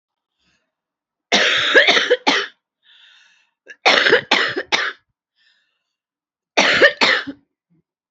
three_cough_length: 8.1 s
three_cough_amplitude: 29667
three_cough_signal_mean_std_ratio: 0.43
survey_phase: alpha (2021-03-01 to 2021-08-12)
age: 18-44
gender: Female
wearing_mask: 'No'
symptom_cough_any: true
symptom_shortness_of_breath: true
symptom_diarrhoea: true
symptom_fatigue: true
symptom_headache: true
symptom_change_to_sense_of_smell_or_taste: true
symptom_loss_of_taste: true
symptom_onset: 4 days
smoker_status: Current smoker (11 or more cigarettes per day)
respiratory_condition_asthma: false
respiratory_condition_other: false
recruitment_source: Test and Trace
submission_delay: 2 days
covid_test_result: Positive
covid_test_method: RT-qPCR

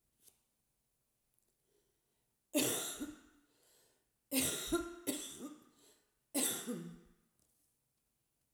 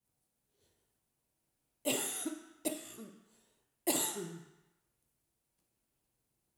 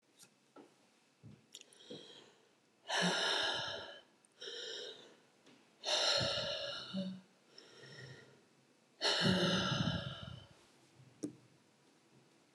cough_length: 8.5 s
cough_amplitude: 2746
cough_signal_mean_std_ratio: 0.38
three_cough_length: 6.6 s
three_cough_amplitude: 4701
three_cough_signal_mean_std_ratio: 0.34
exhalation_length: 12.5 s
exhalation_amplitude: 3060
exhalation_signal_mean_std_ratio: 0.5
survey_phase: alpha (2021-03-01 to 2021-08-12)
age: 65+
gender: Female
wearing_mask: 'No'
symptom_none: true
smoker_status: Never smoked
respiratory_condition_asthma: false
respiratory_condition_other: false
recruitment_source: REACT
submission_delay: 2 days
covid_test_result: Negative
covid_test_method: RT-qPCR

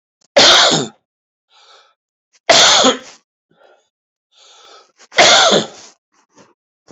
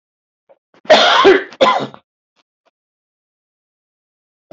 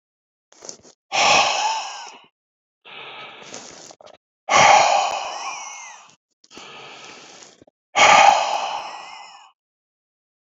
three_cough_length: 6.9 s
three_cough_amplitude: 32767
three_cough_signal_mean_std_ratio: 0.39
cough_length: 4.5 s
cough_amplitude: 31071
cough_signal_mean_std_ratio: 0.34
exhalation_length: 10.5 s
exhalation_amplitude: 28204
exhalation_signal_mean_std_ratio: 0.4
survey_phase: beta (2021-08-13 to 2022-03-07)
age: 65+
gender: Male
wearing_mask: 'No'
symptom_none: true
smoker_status: Ex-smoker
respiratory_condition_asthma: false
respiratory_condition_other: false
recruitment_source: REACT
submission_delay: 3 days
covid_test_result: Negative
covid_test_method: RT-qPCR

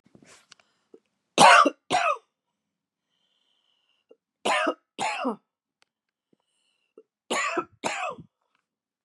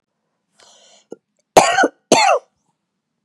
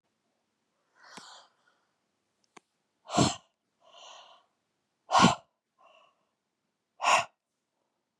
three_cough_length: 9.0 s
three_cough_amplitude: 29610
three_cough_signal_mean_std_ratio: 0.29
cough_length: 3.2 s
cough_amplitude: 32768
cough_signal_mean_std_ratio: 0.33
exhalation_length: 8.2 s
exhalation_amplitude: 13489
exhalation_signal_mean_std_ratio: 0.23
survey_phase: beta (2021-08-13 to 2022-03-07)
age: 45-64
gender: Female
wearing_mask: 'No'
symptom_none: true
smoker_status: Never smoked
respiratory_condition_asthma: false
respiratory_condition_other: false
recruitment_source: REACT
submission_delay: 1 day
covid_test_result: Negative
covid_test_method: RT-qPCR
covid_ct_value: 41.0
covid_ct_gene: N gene
influenza_a_test_result: Unknown/Void
influenza_b_test_result: Unknown/Void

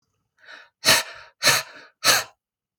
exhalation_length: 2.8 s
exhalation_amplitude: 25958
exhalation_signal_mean_std_ratio: 0.37
survey_phase: beta (2021-08-13 to 2022-03-07)
age: 45-64
gender: Female
wearing_mask: 'No'
symptom_none: true
smoker_status: Ex-smoker
respiratory_condition_asthma: true
respiratory_condition_other: false
recruitment_source: REACT
submission_delay: 1 day
covid_test_result: Negative
covid_test_method: RT-qPCR
influenza_a_test_result: Negative
influenza_b_test_result: Negative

